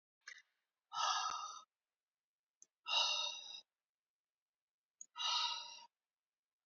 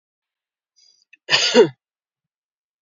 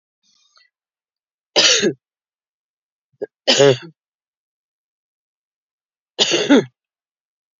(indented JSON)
{
  "exhalation_length": "6.7 s",
  "exhalation_amplitude": 2323,
  "exhalation_signal_mean_std_ratio": 0.41,
  "cough_length": "2.8 s",
  "cough_amplitude": 31348,
  "cough_signal_mean_std_ratio": 0.27,
  "three_cough_length": "7.6 s",
  "three_cough_amplitude": 32587,
  "three_cough_signal_mean_std_ratio": 0.29,
  "survey_phase": "alpha (2021-03-01 to 2021-08-12)",
  "age": "45-64",
  "gender": "Female",
  "wearing_mask": "No",
  "symptom_none": true,
  "smoker_status": "Ex-smoker",
  "respiratory_condition_asthma": false,
  "respiratory_condition_other": false,
  "recruitment_source": "REACT",
  "submission_delay": "1 day",
  "covid_test_result": "Negative",
  "covid_test_method": "RT-qPCR"
}